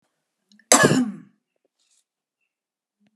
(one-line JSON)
{"cough_length": "3.2 s", "cough_amplitude": 32767, "cough_signal_mean_std_ratio": 0.26, "survey_phase": "alpha (2021-03-01 to 2021-08-12)", "age": "65+", "gender": "Female", "wearing_mask": "No", "symptom_none": true, "smoker_status": "Prefer not to say", "respiratory_condition_asthma": false, "respiratory_condition_other": false, "recruitment_source": "REACT", "submission_delay": "1 day", "covid_test_result": "Negative", "covid_test_method": "RT-qPCR"}